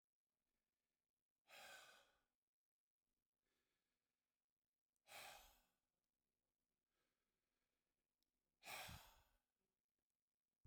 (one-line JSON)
{"exhalation_length": "10.7 s", "exhalation_amplitude": 240, "exhalation_signal_mean_std_ratio": 0.29, "survey_phase": "beta (2021-08-13 to 2022-03-07)", "age": "65+", "gender": "Male", "wearing_mask": "No", "symptom_none": true, "smoker_status": "Ex-smoker", "respiratory_condition_asthma": false, "respiratory_condition_other": false, "recruitment_source": "REACT", "submission_delay": "2 days", "covid_test_result": "Negative", "covid_test_method": "RT-qPCR"}